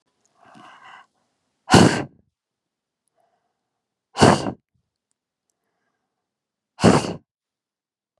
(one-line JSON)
{"exhalation_length": "8.2 s", "exhalation_amplitude": 32757, "exhalation_signal_mean_std_ratio": 0.24, "survey_phase": "beta (2021-08-13 to 2022-03-07)", "age": "45-64", "gender": "Female", "wearing_mask": "No", "symptom_none": true, "smoker_status": "Current smoker (1 to 10 cigarettes per day)", "respiratory_condition_asthma": false, "respiratory_condition_other": false, "recruitment_source": "REACT", "submission_delay": "2 days", "covid_test_result": "Negative", "covid_test_method": "RT-qPCR", "influenza_a_test_result": "Negative", "influenza_b_test_result": "Negative"}